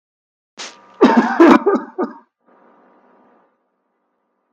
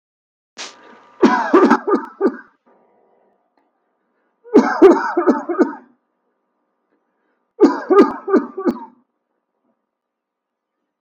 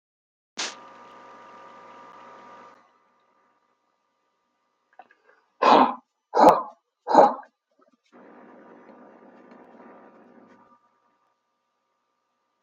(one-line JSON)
{"cough_length": "4.5 s", "cough_amplitude": 32768, "cough_signal_mean_std_ratio": 0.33, "three_cough_length": "11.0 s", "three_cough_amplitude": 32768, "three_cough_signal_mean_std_ratio": 0.36, "exhalation_length": "12.6 s", "exhalation_amplitude": 31403, "exhalation_signal_mean_std_ratio": 0.22, "survey_phase": "beta (2021-08-13 to 2022-03-07)", "age": "65+", "gender": "Male", "wearing_mask": "No", "symptom_none": true, "smoker_status": "Ex-smoker", "respiratory_condition_asthma": false, "respiratory_condition_other": false, "recruitment_source": "REACT", "submission_delay": "2 days", "covid_test_result": "Negative", "covid_test_method": "RT-qPCR", "influenza_a_test_result": "Negative", "influenza_b_test_result": "Negative"}